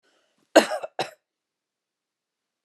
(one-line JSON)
{"cough_length": "2.6 s", "cough_amplitude": 28383, "cough_signal_mean_std_ratio": 0.19, "survey_phase": "beta (2021-08-13 to 2022-03-07)", "age": "45-64", "gender": "Female", "wearing_mask": "No", "symptom_cough_any": true, "symptom_runny_or_blocked_nose": true, "symptom_onset": "3 days", "smoker_status": "Never smoked", "respiratory_condition_asthma": false, "respiratory_condition_other": false, "recruitment_source": "REACT", "submission_delay": "2 days", "covid_test_result": "Negative", "covid_test_method": "RT-qPCR"}